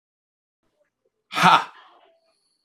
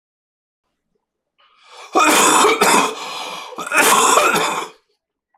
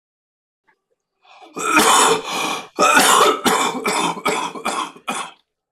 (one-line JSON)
{"exhalation_length": "2.6 s", "exhalation_amplitude": 25937, "exhalation_signal_mean_std_ratio": 0.24, "three_cough_length": "5.4 s", "three_cough_amplitude": 26027, "three_cough_signal_mean_std_ratio": 0.56, "cough_length": "5.7 s", "cough_amplitude": 26028, "cough_signal_mean_std_ratio": 0.6, "survey_phase": "alpha (2021-03-01 to 2021-08-12)", "age": "45-64", "gender": "Male", "wearing_mask": "No", "symptom_cough_any": true, "symptom_change_to_sense_of_smell_or_taste": true, "symptom_onset": "9 days", "smoker_status": "Ex-smoker", "respiratory_condition_asthma": true, "respiratory_condition_other": false, "recruitment_source": "REACT", "submission_delay": "7 days", "covid_test_result": "Negative", "covid_test_method": "RT-qPCR"}